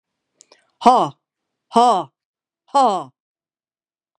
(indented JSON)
{
  "exhalation_length": "4.2 s",
  "exhalation_amplitude": 32767,
  "exhalation_signal_mean_std_ratio": 0.33,
  "survey_phase": "beta (2021-08-13 to 2022-03-07)",
  "age": "45-64",
  "gender": "Female",
  "wearing_mask": "No",
  "symptom_cough_any": true,
  "symptom_new_continuous_cough": true,
  "symptom_runny_or_blocked_nose": true,
  "symptom_sore_throat": true,
  "symptom_fatigue": true,
  "symptom_fever_high_temperature": true,
  "symptom_headache": true,
  "symptom_change_to_sense_of_smell_or_taste": true,
  "symptom_other": true,
  "symptom_onset": "2 days",
  "smoker_status": "Never smoked",
  "respiratory_condition_asthma": false,
  "respiratory_condition_other": false,
  "recruitment_source": "Test and Trace",
  "submission_delay": "1 day",
  "covid_test_result": "Positive",
  "covid_test_method": "ePCR"
}